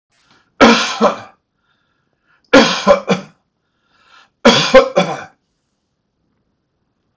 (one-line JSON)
{"three_cough_length": "7.2 s", "three_cough_amplitude": 32768, "three_cough_signal_mean_std_ratio": 0.35, "survey_phase": "beta (2021-08-13 to 2022-03-07)", "age": "65+", "gender": "Male", "wearing_mask": "No", "symptom_none": true, "smoker_status": "Never smoked", "respiratory_condition_asthma": false, "respiratory_condition_other": false, "recruitment_source": "REACT", "submission_delay": "3 days", "covid_test_result": "Negative", "covid_test_method": "RT-qPCR"}